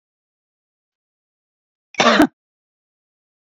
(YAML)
cough_length: 3.5 s
cough_amplitude: 28203
cough_signal_mean_std_ratio: 0.22
survey_phase: beta (2021-08-13 to 2022-03-07)
age: 45-64
gender: Female
wearing_mask: 'No'
symptom_cough_any: true
symptom_onset: 12 days
smoker_status: Never smoked
respiratory_condition_asthma: false
respiratory_condition_other: false
recruitment_source: REACT
submission_delay: 2 days
covid_test_result: Negative
covid_test_method: RT-qPCR